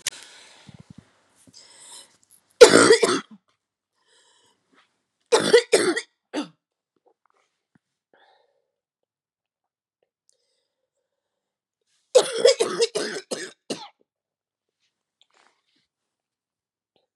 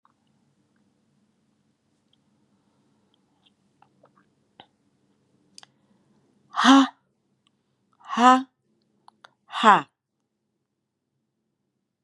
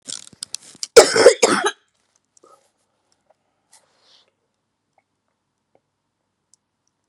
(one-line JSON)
{"three_cough_length": "17.2 s", "three_cough_amplitude": 32768, "three_cough_signal_mean_std_ratio": 0.23, "exhalation_length": "12.0 s", "exhalation_amplitude": 27873, "exhalation_signal_mean_std_ratio": 0.19, "cough_length": "7.1 s", "cough_amplitude": 32768, "cough_signal_mean_std_ratio": 0.2, "survey_phase": "beta (2021-08-13 to 2022-03-07)", "age": "18-44", "gender": "Female", "wearing_mask": "No", "symptom_cough_any": true, "symptom_runny_or_blocked_nose": true, "symptom_sore_throat": true, "symptom_fatigue": true, "symptom_fever_high_temperature": true, "symptom_headache": true, "symptom_change_to_sense_of_smell_or_taste": true, "symptom_loss_of_taste": true, "symptom_onset": "5 days", "smoker_status": "Never smoked", "respiratory_condition_asthma": false, "respiratory_condition_other": false, "recruitment_source": "Test and Trace", "submission_delay": "3 days", "covid_test_result": "Positive", "covid_test_method": "ePCR"}